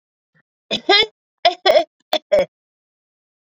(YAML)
three_cough_length: 3.5 s
three_cough_amplitude: 28251
three_cough_signal_mean_std_ratio: 0.35
survey_phase: beta (2021-08-13 to 2022-03-07)
age: 45-64
gender: Female
wearing_mask: 'No'
symptom_runny_or_blocked_nose: true
symptom_abdominal_pain: true
symptom_headache: true
symptom_change_to_sense_of_smell_or_taste: true
smoker_status: Never smoked
respiratory_condition_asthma: false
respiratory_condition_other: false
recruitment_source: Test and Trace
submission_delay: 2 days
covid_test_result: Positive
covid_test_method: RT-qPCR